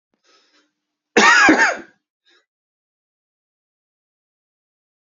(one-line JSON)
{"cough_length": "5.0 s", "cough_amplitude": 28701, "cough_signal_mean_std_ratio": 0.28, "survey_phase": "beta (2021-08-13 to 2022-03-07)", "age": "18-44", "gender": "Male", "wearing_mask": "No", "symptom_cough_any": true, "symptom_runny_or_blocked_nose": true, "symptom_shortness_of_breath": true, "symptom_fatigue": true, "symptom_onset": "3 days", "smoker_status": "Ex-smoker", "respiratory_condition_asthma": true, "respiratory_condition_other": false, "recruitment_source": "Test and Trace", "submission_delay": "1 day", "covid_test_result": "Positive", "covid_test_method": "RT-qPCR", "covid_ct_value": 20.6, "covid_ct_gene": "ORF1ab gene", "covid_ct_mean": 21.1, "covid_viral_load": "120000 copies/ml", "covid_viral_load_category": "Low viral load (10K-1M copies/ml)"}